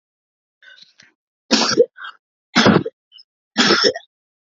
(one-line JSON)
{"three_cough_length": "4.5 s", "three_cough_amplitude": 32768, "three_cough_signal_mean_std_ratio": 0.37, "survey_phase": "beta (2021-08-13 to 2022-03-07)", "age": "18-44", "gender": "Female", "wearing_mask": "No", "symptom_cough_any": true, "symptom_runny_or_blocked_nose": true, "symptom_fatigue": true, "symptom_onset": "6 days", "smoker_status": "Never smoked", "respiratory_condition_asthma": false, "respiratory_condition_other": false, "recruitment_source": "REACT", "submission_delay": "1 day", "covid_test_result": "Positive", "covid_test_method": "RT-qPCR", "covid_ct_value": 27.0, "covid_ct_gene": "E gene", "influenza_a_test_result": "Negative", "influenza_b_test_result": "Negative"}